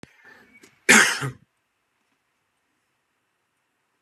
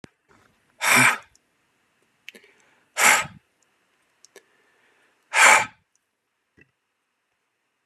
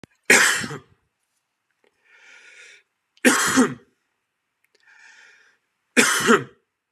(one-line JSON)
{"cough_length": "4.0 s", "cough_amplitude": 29651, "cough_signal_mean_std_ratio": 0.22, "exhalation_length": "7.9 s", "exhalation_amplitude": 28948, "exhalation_signal_mean_std_ratio": 0.27, "three_cough_length": "6.9 s", "three_cough_amplitude": 31488, "three_cough_signal_mean_std_ratio": 0.34, "survey_phase": "beta (2021-08-13 to 2022-03-07)", "age": "18-44", "gender": "Male", "wearing_mask": "No", "symptom_diarrhoea": true, "smoker_status": "Ex-smoker", "respiratory_condition_asthma": false, "respiratory_condition_other": false, "recruitment_source": "REACT", "submission_delay": "1 day", "covid_test_result": "Negative", "covid_test_method": "RT-qPCR"}